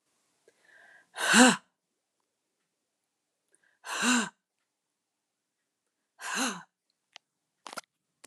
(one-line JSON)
{"exhalation_length": "8.3 s", "exhalation_amplitude": 20929, "exhalation_signal_mean_std_ratio": 0.24, "survey_phase": "alpha (2021-03-01 to 2021-08-12)", "age": "45-64", "gender": "Female", "wearing_mask": "No", "symptom_none": true, "smoker_status": "Never smoked", "respiratory_condition_asthma": false, "respiratory_condition_other": false, "recruitment_source": "REACT", "submission_delay": "2 days", "covid_test_result": "Negative", "covid_test_method": "RT-qPCR"}